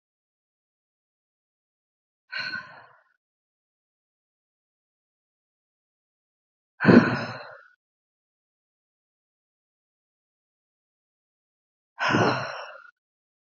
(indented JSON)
{
  "exhalation_length": "13.6 s",
  "exhalation_amplitude": 25734,
  "exhalation_signal_mean_std_ratio": 0.2,
  "survey_phase": "alpha (2021-03-01 to 2021-08-12)",
  "age": "18-44",
  "gender": "Female",
  "wearing_mask": "No",
  "symptom_cough_any": true,
  "symptom_new_continuous_cough": true,
  "symptom_diarrhoea": true,
  "symptom_fatigue": true,
  "symptom_fever_high_temperature": true,
  "symptom_headache": true,
  "symptom_change_to_sense_of_smell_or_taste": true,
  "symptom_loss_of_taste": true,
  "symptom_onset": "4 days",
  "smoker_status": "Ex-smoker",
  "respiratory_condition_asthma": false,
  "respiratory_condition_other": false,
  "recruitment_source": "Test and Trace",
  "submission_delay": "2 days",
  "covid_test_result": "Positive",
  "covid_test_method": "RT-qPCR",
  "covid_ct_value": 20.1,
  "covid_ct_gene": "ORF1ab gene"
}